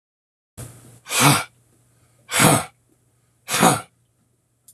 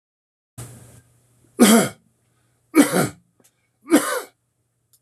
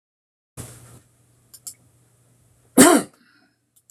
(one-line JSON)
{"exhalation_length": "4.7 s", "exhalation_amplitude": 26480, "exhalation_signal_mean_std_ratio": 0.35, "three_cough_length": "5.0 s", "three_cough_amplitude": 26174, "three_cough_signal_mean_std_ratio": 0.32, "cough_length": "3.9 s", "cough_amplitude": 28332, "cough_signal_mean_std_ratio": 0.21, "survey_phase": "alpha (2021-03-01 to 2021-08-12)", "age": "65+", "gender": "Male", "wearing_mask": "No", "symptom_none": true, "smoker_status": "Never smoked", "respiratory_condition_asthma": false, "respiratory_condition_other": false, "recruitment_source": "REACT", "submission_delay": "1 day", "covid_test_result": "Negative", "covid_test_method": "RT-qPCR"}